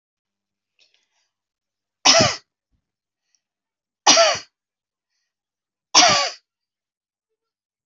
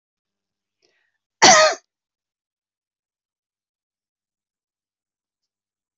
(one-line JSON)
{"three_cough_length": "7.9 s", "three_cough_amplitude": 31080, "three_cough_signal_mean_std_ratio": 0.27, "cough_length": "6.0 s", "cough_amplitude": 27634, "cough_signal_mean_std_ratio": 0.18, "survey_phase": "alpha (2021-03-01 to 2021-08-12)", "age": "65+", "gender": "Female", "wearing_mask": "No", "symptom_none": true, "smoker_status": "Ex-smoker", "respiratory_condition_asthma": false, "respiratory_condition_other": false, "recruitment_source": "REACT", "submission_delay": "1 day", "covid_test_result": "Negative", "covid_test_method": "RT-qPCR"}